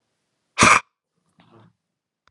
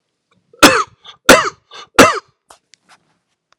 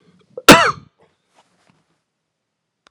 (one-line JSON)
{"exhalation_length": "2.3 s", "exhalation_amplitude": 30827, "exhalation_signal_mean_std_ratio": 0.24, "three_cough_length": "3.6 s", "three_cough_amplitude": 32768, "three_cough_signal_mean_std_ratio": 0.31, "cough_length": "2.9 s", "cough_amplitude": 32768, "cough_signal_mean_std_ratio": 0.21, "survey_phase": "alpha (2021-03-01 to 2021-08-12)", "age": "45-64", "gender": "Male", "wearing_mask": "No", "symptom_fatigue": true, "symptom_fever_high_temperature": true, "symptom_change_to_sense_of_smell_or_taste": true, "smoker_status": "Ex-smoker", "respiratory_condition_asthma": false, "respiratory_condition_other": false, "recruitment_source": "Test and Trace", "submission_delay": "3 days", "covid_test_result": "Positive", "covid_test_method": "RT-qPCR", "covid_ct_value": 28.3, "covid_ct_gene": "ORF1ab gene", "covid_ct_mean": 29.5, "covid_viral_load": "210 copies/ml", "covid_viral_load_category": "Minimal viral load (< 10K copies/ml)"}